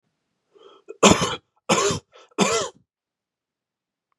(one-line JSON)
{"three_cough_length": "4.2 s", "three_cough_amplitude": 32022, "three_cough_signal_mean_std_ratio": 0.33, "survey_phase": "beta (2021-08-13 to 2022-03-07)", "age": "18-44", "gender": "Male", "wearing_mask": "No", "symptom_runny_or_blocked_nose": true, "symptom_headache": true, "smoker_status": "Never smoked", "respiratory_condition_asthma": false, "respiratory_condition_other": false, "recruitment_source": "Test and Trace", "submission_delay": "2 days", "covid_test_result": "Positive", "covid_test_method": "RT-qPCR", "covid_ct_value": 21.9, "covid_ct_gene": "N gene"}